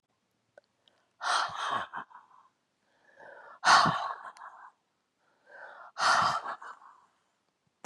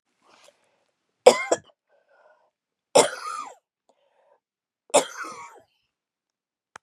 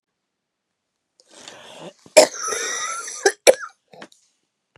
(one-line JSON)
{"exhalation_length": "7.9 s", "exhalation_amplitude": 12004, "exhalation_signal_mean_std_ratio": 0.36, "three_cough_length": "6.8 s", "three_cough_amplitude": 32549, "three_cough_signal_mean_std_ratio": 0.2, "cough_length": "4.8 s", "cough_amplitude": 32768, "cough_signal_mean_std_ratio": 0.26, "survey_phase": "beta (2021-08-13 to 2022-03-07)", "age": "65+", "gender": "Female", "wearing_mask": "No", "symptom_cough_any": true, "symptom_runny_or_blocked_nose": true, "symptom_sore_throat": true, "symptom_diarrhoea": true, "symptom_fatigue": true, "symptom_fever_high_temperature": true, "symptom_onset": "4 days", "smoker_status": "Never smoked", "respiratory_condition_asthma": false, "respiratory_condition_other": false, "recruitment_source": "Test and Trace", "submission_delay": "2 days", "covid_test_result": "Positive", "covid_test_method": "ePCR"}